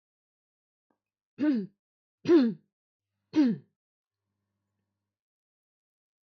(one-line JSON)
{"three_cough_length": "6.2 s", "three_cough_amplitude": 8007, "three_cough_signal_mean_std_ratio": 0.28, "survey_phase": "beta (2021-08-13 to 2022-03-07)", "age": "45-64", "gender": "Female", "wearing_mask": "No", "symptom_none": true, "smoker_status": "Never smoked", "respiratory_condition_asthma": false, "respiratory_condition_other": false, "recruitment_source": "REACT", "submission_delay": "1 day", "covid_test_result": "Negative", "covid_test_method": "RT-qPCR", "influenza_a_test_result": "Negative", "influenza_b_test_result": "Negative"}